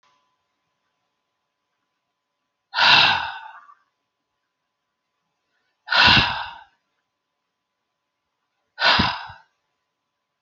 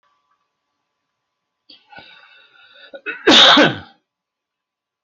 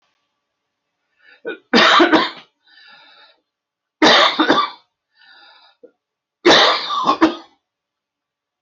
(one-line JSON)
{"exhalation_length": "10.4 s", "exhalation_amplitude": 29249, "exhalation_signal_mean_std_ratio": 0.29, "cough_length": "5.0 s", "cough_amplitude": 31935, "cough_signal_mean_std_ratio": 0.28, "three_cough_length": "8.6 s", "three_cough_amplitude": 31154, "three_cough_signal_mean_std_ratio": 0.39, "survey_phase": "alpha (2021-03-01 to 2021-08-12)", "age": "65+", "gender": "Male", "wearing_mask": "No", "symptom_none": true, "smoker_status": "Ex-smoker", "respiratory_condition_asthma": false, "respiratory_condition_other": false, "recruitment_source": "REACT", "submission_delay": "3 days", "covid_test_result": "Negative", "covid_test_method": "RT-qPCR"}